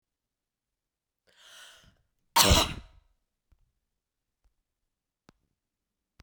{"cough_length": "6.2 s", "cough_amplitude": 20328, "cough_signal_mean_std_ratio": 0.19, "survey_phase": "beta (2021-08-13 to 2022-03-07)", "age": "45-64", "gender": "Female", "wearing_mask": "No", "symptom_cough_any": true, "symptom_runny_or_blocked_nose": true, "symptom_sore_throat": true, "symptom_fatigue": true, "symptom_change_to_sense_of_smell_or_taste": true, "symptom_loss_of_taste": true, "symptom_onset": "6 days", "smoker_status": "Ex-smoker", "respiratory_condition_asthma": false, "respiratory_condition_other": false, "recruitment_source": "Test and Trace", "submission_delay": "2 days", "covid_test_result": "Positive", "covid_test_method": "RT-qPCR", "covid_ct_value": 17.3, "covid_ct_gene": "ORF1ab gene", "covid_ct_mean": 17.7, "covid_viral_load": "1500000 copies/ml", "covid_viral_load_category": "High viral load (>1M copies/ml)"}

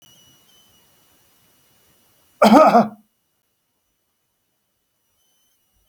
{"cough_length": "5.9 s", "cough_amplitude": 27374, "cough_signal_mean_std_ratio": 0.23, "survey_phase": "alpha (2021-03-01 to 2021-08-12)", "age": "45-64", "gender": "Male", "wearing_mask": "No", "symptom_none": true, "smoker_status": "Never smoked", "respiratory_condition_asthma": false, "respiratory_condition_other": false, "recruitment_source": "REACT", "submission_delay": "1 day", "covid_test_result": "Negative", "covid_test_method": "RT-qPCR"}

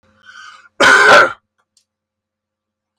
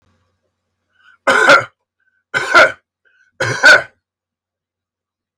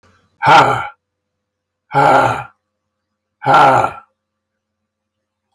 {"cough_length": "3.0 s", "cough_amplitude": 32757, "cough_signal_mean_std_ratio": 0.37, "three_cough_length": "5.4 s", "three_cough_amplitude": 32768, "three_cough_signal_mean_std_ratio": 0.34, "exhalation_length": "5.5 s", "exhalation_amplitude": 32768, "exhalation_signal_mean_std_ratio": 0.4, "survey_phase": "alpha (2021-03-01 to 2021-08-12)", "age": "45-64", "gender": "Male", "wearing_mask": "No", "symptom_none": true, "smoker_status": "Ex-smoker", "respiratory_condition_asthma": false, "respiratory_condition_other": false, "recruitment_source": "REACT", "submission_delay": "2 days", "covid_test_result": "Negative", "covid_test_method": "RT-qPCR"}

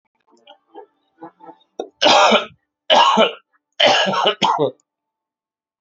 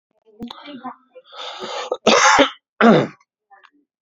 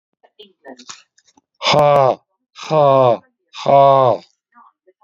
{"three_cough_length": "5.8 s", "three_cough_amplitude": 29330, "three_cough_signal_mean_std_ratio": 0.45, "cough_length": "4.0 s", "cough_amplitude": 32768, "cough_signal_mean_std_ratio": 0.4, "exhalation_length": "5.0 s", "exhalation_amplitude": 32111, "exhalation_signal_mean_std_ratio": 0.44, "survey_phase": "beta (2021-08-13 to 2022-03-07)", "age": "45-64", "gender": "Male", "wearing_mask": "No", "symptom_cough_any": true, "smoker_status": "Ex-smoker", "respiratory_condition_asthma": false, "respiratory_condition_other": false, "recruitment_source": "REACT", "submission_delay": "1 day", "covid_test_result": "Negative", "covid_test_method": "RT-qPCR"}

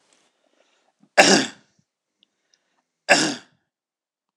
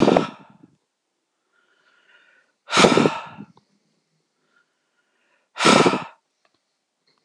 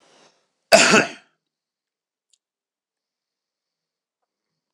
{"three_cough_length": "4.4 s", "three_cough_amplitude": 26028, "three_cough_signal_mean_std_ratio": 0.26, "exhalation_length": "7.2 s", "exhalation_amplitude": 26028, "exhalation_signal_mean_std_ratio": 0.3, "cough_length": "4.7 s", "cough_amplitude": 26028, "cough_signal_mean_std_ratio": 0.2, "survey_phase": "alpha (2021-03-01 to 2021-08-12)", "age": "45-64", "gender": "Male", "wearing_mask": "No", "symptom_none": true, "smoker_status": "Never smoked", "respiratory_condition_asthma": false, "respiratory_condition_other": false, "recruitment_source": "REACT", "submission_delay": "4 days", "covid_test_result": "Negative", "covid_test_method": "RT-qPCR"}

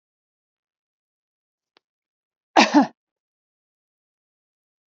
{"cough_length": "4.9 s", "cough_amplitude": 27391, "cough_signal_mean_std_ratio": 0.18, "survey_phase": "beta (2021-08-13 to 2022-03-07)", "age": "45-64", "gender": "Female", "wearing_mask": "No", "symptom_none": true, "smoker_status": "Ex-smoker", "respiratory_condition_asthma": false, "respiratory_condition_other": false, "recruitment_source": "REACT", "submission_delay": "1 day", "covid_test_result": "Negative", "covid_test_method": "RT-qPCR", "influenza_a_test_result": "Negative", "influenza_b_test_result": "Negative"}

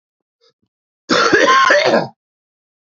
{"cough_length": "3.0 s", "cough_amplitude": 28537, "cough_signal_mean_std_ratio": 0.49, "survey_phase": "beta (2021-08-13 to 2022-03-07)", "age": "45-64", "gender": "Male", "wearing_mask": "No", "symptom_cough_any": true, "symptom_runny_or_blocked_nose": true, "symptom_shortness_of_breath": true, "smoker_status": "Ex-smoker", "respiratory_condition_asthma": false, "respiratory_condition_other": false, "recruitment_source": "Test and Trace", "submission_delay": "1 day", "covid_test_result": "Positive", "covid_test_method": "RT-qPCR", "covid_ct_value": 21.4, "covid_ct_gene": "ORF1ab gene", "covid_ct_mean": 21.8, "covid_viral_load": "72000 copies/ml", "covid_viral_load_category": "Low viral load (10K-1M copies/ml)"}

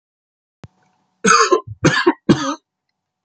{"cough_length": "3.2 s", "cough_amplitude": 30188, "cough_signal_mean_std_ratio": 0.4, "survey_phase": "beta (2021-08-13 to 2022-03-07)", "age": "45-64", "gender": "Male", "wearing_mask": "No", "symptom_other": true, "symptom_onset": "7 days", "smoker_status": "Ex-smoker", "respiratory_condition_asthma": false, "respiratory_condition_other": false, "recruitment_source": "Test and Trace", "submission_delay": "2 days", "covid_test_result": "Positive", "covid_test_method": "RT-qPCR"}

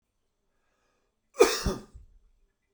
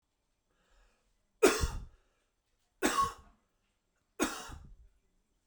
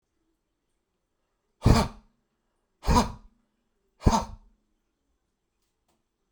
{"cough_length": "2.7 s", "cough_amplitude": 15494, "cough_signal_mean_std_ratio": 0.24, "three_cough_length": "5.5 s", "three_cough_amplitude": 9530, "three_cough_signal_mean_std_ratio": 0.29, "exhalation_length": "6.3 s", "exhalation_amplitude": 18536, "exhalation_signal_mean_std_ratio": 0.24, "survey_phase": "beta (2021-08-13 to 2022-03-07)", "age": "18-44", "gender": "Male", "wearing_mask": "No", "symptom_none": true, "smoker_status": "Never smoked", "respiratory_condition_asthma": false, "respiratory_condition_other": false, "recruitment_source": "REACT", "submission_delay": "2 days", "covid_test_result": "Negative", "covid_test_method": "RT-qPCR"}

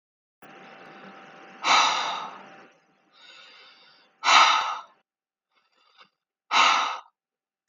{"exhalation_length": "7.7 s", "exhalation_amplitude": 24493, "exhalation_signal_mean_std_ratio": 0.36, "survey_phase": "beta (2021-08-13 to 2022-03-07)", "age": "18-44", "gender": "Female", "wearing_mask": "No", "symptom_none": true, "symptom_onset": "13 days", "smoker_status": "Never smoked", "respiratory_condition_asthma": false, "respiratory_condition_other": false, "recruitment_source": "REACT", "submission_delay": "2 days", "covid_test_result": "Negative", "covid_test_method": "RT-qPCR"}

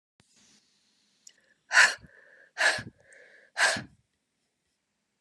{"exhalation_length": "5.2 s", "exhalation_amplitude": 16787, "exhalation_signal_mean_std_ratio": 0.27, "survey_phase": "beta (2021-08-13 to 2022-03-07)", "age": "45-64", "gender": "Female", "wearing_mask": "No", "symptom_none": true, "smoker_status": "Never smoked", "respiratory_condition_asthma": false, "respiratory_condition_other": false, "recruitment_source": "REACT", "submission_delay": "2 days", "covid_test_result": "Negative", "covid_test_method": "RT-qPCR", "influenza_a_test_result": "Negative", "influenza_b_test_result": "Negative"}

